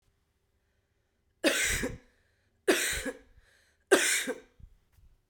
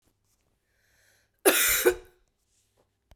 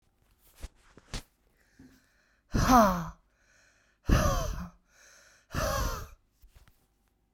{"three_cough_length": "5.3 s", "three_cough_amplitude": 13458, "three_cough_signal_mean_std_ratio": 0.38, "cough_length": "3.2 s", "cough_amplitude": 19093, "cough_signal_mean_std_ratio": 0.31, "exhalation_length": "7.3 s", "exhalation_amplitude": 13371, "exhalation_signal_mean_std_ratio": 0.35, "survey_phase": "beta (2021-08-13 to 2022-03-07)", "age": "45-64", "gender": "Female", "wearing_mask": "No", "symptom_sore_throat": true, "symptom_fatigue": true, "symptom_onset": "2 days", "smoker_status": "Never smoked", "respiratory_condition_asthma": true, "respiratory_condition_other": false, "recruitment_source": "REACT", "submission_delay": "1 day", "covid_test_result": "Negative", "covid_test_method": "RT-qPCR"}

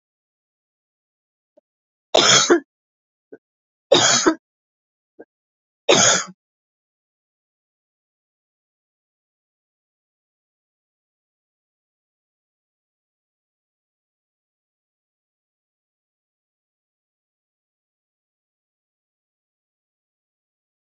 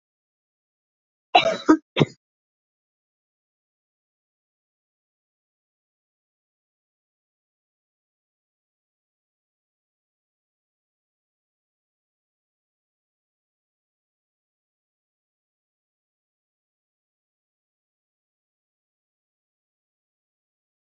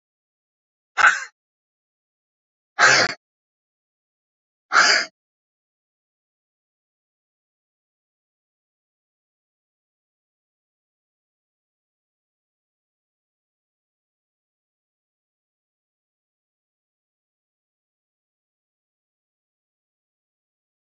{"three_cough_length": "20.9 s", "three_cough_amplitude": 32768, "three_cough_signal_mean_std_ratio": 0.18, "cough_length": "20.9 s", "cough_amplitude": 27540, "cough_signal_mean_std_ratio": 0.09, "exhalation_length": "20.9 s", "exhalation_amplitude": 26294, "exhalation_signal_mean_std_ratio": 0.15, "survey_phase": "alpha (2021-03-01 to 2021-08-12)", "age": "45-64", "gender": "Female", "wearing_mask": "No", "symptom_none": true, "smoker_status": "Never smoked", "respiratory_condition_asthma": false, "respiratory_condition_other": false, "recruitment_source": "REACT", "submission_delay": "1 day", "covid_test_result": "Negative", "covid_test_method": "RT-qPCR"}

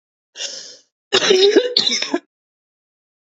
{"cough_length": "3.2 s", "cough_amplitude": 32768, "cough_signal_mean_std_ratio": 0.45, "survey_phase": "beta (2021-08-13 to 2022-03-07)", "age": "18-44", "gender": "Female", "wearing_mask": "No", "symptom_none": true, "smoker_status": "Ex-smoker", "respiratory_condition_asthma": false, "respiratory_condition_other": false, "recruitment_source": "REACT", "submission_delay": "3 days", "covid_test_result": "Negative", "covid_test_method": "RT-qPCR", "influenza_a_test_result": "Negative", "influenza_b_test_result": "Negative"}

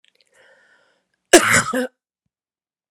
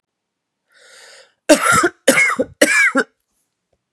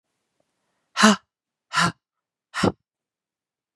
{"cough_length": "2.9 s", "cough_amplitude": 32768, "cough_signal_mean_std_ratio": 0.27, "three_cough_length": "3.9 s", "three_cough_amplitude": 32768, "three_cough_signal_mean_std_ratio": 0.43, "exhalation_length": "3.8 s", "exhalation_amplitude": 32618, "exhalation_signal_mean_std_ratio": 0.27, "survey_phase": "beta (2021-08-13 to 2022-03-07)", "age": "18-44", "gender": "Female", "wearing_mask": "No", "symptom_cough_any": true, "symptom_new_continuous_cough": true, "symptom_runny_or_blocked_nose": true, "symptom_sore_throat": true, "symptom_fatigue": true, "symptom_headache": true, "symptom_change_to_sense_of_smell_or_taste": true, "smoker_status": "Never smoked", "respiratory_condition_asthma": false, "respiratory_condition_other": false, "recruitment_source": "Test and Trace", "submission_delay": "2 days", "covid_test_result": "Positive", "covid_test_method": "LFT"}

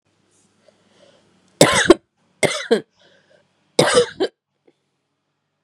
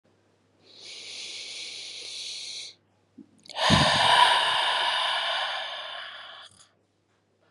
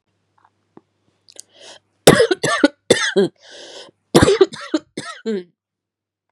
{"three_cough_length": "5.6 s", "three_cough_amplitude": 32768, "three_cough_signal_mean_std_ratio": 0.29, "exhalation_length": "7.5 s", "exhalation_amplitude": 20035, "exhalation_signal_mean_std_ratio": 0.53, "cough_length": "6.3 s", "cough_amplitude": 32768, "cough_signal_mean_std_ratio": 0.34, "survey_phase": "beta (2021-08-13 to 2022-03-07)", "age": "18-44", "gender": "Female", "wearing_mask": "Yes", "symptom_cough_any": true, "symptom_new_continuous_cough": true, "symptom_runny_or_blocked_nose": true, "symptom_fatigue": true, "symptom_headache": true, "symptom_other": true, "symptom_onset": "5 days", "smoker_status": "Never smoked", "respiratory_condition_asthma": false, "respiratory_condition_other": false, "recruitment_source": "Test and Trace", "submission_delay": "2 days", "covid_test_result": "Positive", "covid_test_method": "RT-qPCR", "covid_ct_value": 16.4, "covid_ct_gene": "ORF1ab gene", "covid_ct_mean": 16.8, "covid_viral_load": "3000000 copies/ml", "covid_viral_load_category": "High viral load (>1M copies/ml)"}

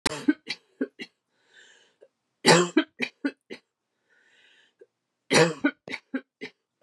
{"three_cough_length": "6.8 s", "three_cough_amplitude": 22358, "three_cough_signal_mean_std_ratio": 0.29, "survey_phase": "beta (2021-08-13 to 2022-03-07)", "age": "45-64", "gender": "Female", "wearing_mask": "No", "symptom_cough_any": true, "symptom_runny_or_blocked_nose": true, "symptom_fatigue": true, "symptom_headache": true, "smoker_status": "Never smoked", "respiratory_condition_asthma": false, "respiratory_condition_other": false, "recruitment_source": "Test and Trace", "submission_delay": "2 days", "covid_test_result": "Positive", "covid_test_method": "RT-qPCR", "covid_ct_value": 30.1, "covid_ct_gene": "ORF1ab gene", "covid_ct_mean": 30.5, "covid_viral_load": "98 copies/ml", "covid_viral_load_category": "Minimal viral load (< 10K copies/ml)"}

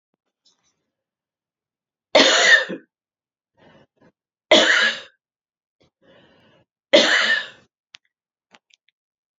{"three_cough_length": "9.4 s", "three_cough_amplitude": 29172, "three_cough_signal_mean_std_ratio": 0.31, "survey_phase": "beta (2021-08-13 to 2022-03-07)", "age": "45-64", "gender": "Female", "wearing_mask": "No", "symptom_new_continuous_cough": true, "symptom_runny_or_blocked_nose": true, "symptom_shortness_of_breath": true, "symptom_sore_throat": true, "symptom_fatigue": true, "symptom_headache": true, "symptom_change_to_sense_of_smell_or_taste": true, "symptom_onset": "4 days", "smoker_status": "Never smoked", "respiratory_condition_asthma": false, "respiratory_condition_other": false, "recruitment_source": "Test and Trace", "submission_delay": "2 days", "covid_test_result": "Positive", "covid_test_method": "RT-qPCR", "covid_ct_value": 21.9, "covid_ct_gene": "N gene", "covid_ct_mean": 22.4, "covid_viral_load": "45000 copies/ml", "covid_viral_load_category": "Low viral load (10K-1M copies/ml)"}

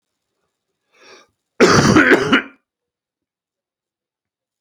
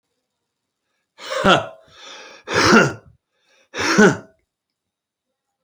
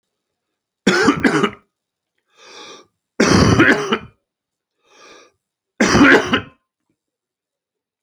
{"cough_length": "4.6 s", "cough_amplitude": 32767, "cough_signal_mean_std_ratio": 0.34, "exhalation_length": "5.6 s", "exhalation_amplitude": 30317, "exhalation_signal_mean_std_ratio": 0.35, "three_cough_length": "8.0 s", "three_cough_amplitude": 32069, "three_cough_signal_mean_std_ratio": 0.4, "survey_phase": "beta (2021-08-13 to 2022-03-07)", "age": "45-64", "gender": "Male", "wearing_mask": "No", "symptom_cough_any": true, "symptom_new_continuous_cough": true, "symptom_runny_or_blocked_nose": true, "symptom_shortness_of_breath": true, "symptom_sore_throat": true, "symptom_diarrhoea": true, "symptom_fatigue": true, "symptom_fever_high_temperature": true, "symptom_headache": true, "symptom_change_to_sense_of_smell_or_taste": true, "symptom_onset": "4 days", "smoker_status": "Never smoked", "respiratory_condition_asthma": false, "respiratory_condition_other": false, "recruitment_source": "Test and Trace", "submission_delay": "2 days", "covid_test_result": "Positive", "covid_test_method": "RT-qPCR", "covid_ct_value": 18.9, "covid_ct_gene": "ORF1ab gene", "covid_ct_mean": 19.6, "covid_viral_load": "370000 copies/ml", "covid_viral_load_category": "Low viral load (10K-1M copies/ml)"}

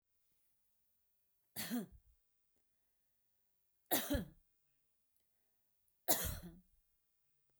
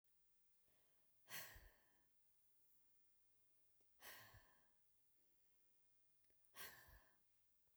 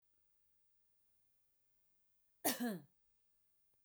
{"three_cough_length": "7.6 s", "three_cough_amplitude": 4279, "three_cough_signal_mean_std_ratio": 0.27, "exhalation_length": "7.8 s", "exhalation_amplitude": 317, "exhalation_signal_mean_std_ratio": 0.57, "cough_length": "3.8 s", "cough_amplitude": 3415, "cough_signal_mean_std_ratio": 0.26, "survey_phase": "beta (2021-08-13 to 2022-03-07)", "age": "45-64", "gender": "Female", "wearing_mask": "No", "symptom_none": true, "smoker_status": "Never smoked", "respiratory_condition_asthma": false, "respiratory_condition_other": false, "recruitment_source": "REACT", "submission_delay": "1 day", "covid_test_result": "Negative", "covid_test_method": "RT-qPCR"}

